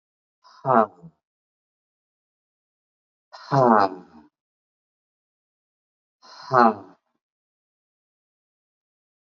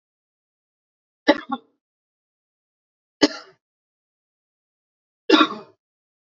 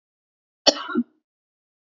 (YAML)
exhalation_length: 9.3 s
exhalation_amplitude: 28318
exhalation_signal_mean_std_ratio: 0.22
three_cough_length: 6.2 s
three_cough_amplitude: 28544
three_cough_signal_mean_std_ratio: 0.19
cough_length: 2.0 s
cough_amplitude: 29688
cough_signal_mean_std_ratio: 0.23
survey_phase: beta (2021-08-13 to 2022-03-07)
age: 45-64
gender: Male
wearing_mask: 'No'
symptom_none: true
smoker_status: Never smoked
respiratory_condition_asthma: true
respiratory_condition_other: false
recruitment_source: REACT
submission_delay: 3 days
covid_test_result: Negative
covid_test_method: RT-qPCR
influenza_a_test_result: Negative
influenza_b_test_result: Negative